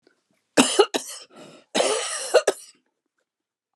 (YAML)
cough_length: 3.8 s
cough_amplitude: 29809
cough_signal_mean_std_ratio: 0.37
survey_phase: beta (2021-08-13 to 2022-03-07)
age: 65+
gender: Female
wearing_mask: 'No'
symptom_cough_any: true
symptom_fatigue: true
symptom_onset: 13 days
smoker_status: Never smoked
respiratory_condition_asthma: false
respiratory_condition_other: true
recruitment_source: REACT
submission_delay: 6 days
covid_test_result: Negative
covid_test_method: RT-qPCR
influenza_a_test_result: Negative
influenza_b_test_result: Negative